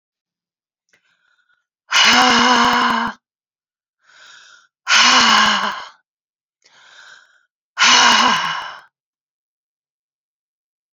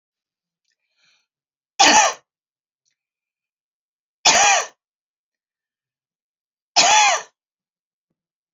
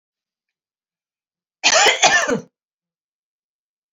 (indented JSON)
{
  "exhalation_length": "10.9 s",
  "exhalation_amplitude": 32767,
  "exhalation_signal_mean_std_ratio": 0.43,
  "three_cough_length": "8.5 s",
  "three_cough_amplitude": 32273,
  "three_cough_signal_mean_std_ratio": 0.3,
  "cough_length": "3.9 s",
  "cough_amplitude": 31909,
  "cough_signal_mean_std_ratio": 0.33,
  "survey_phase": "beta (2021-08-13 to 2022-03-07)",
  "age": "45-64",
  "gender": "Female",
  "wearing_mask": "No",
  "symptom_runny_or_blocked_nose": true,
  "symptom_sore_throat": true,
  "symptom_headache": true,
  "symptom_other": true,
  "smoker_status": "Never smoked",
  "respiratory_condition_asthma": false,
  "respiratory_condition_other": false,
  "recruitment_source": "Test and Trace",
  "submission_delay": "2 days",
  "covid_test_result": "Positive",
  "covid_test_method": "ePCR"
}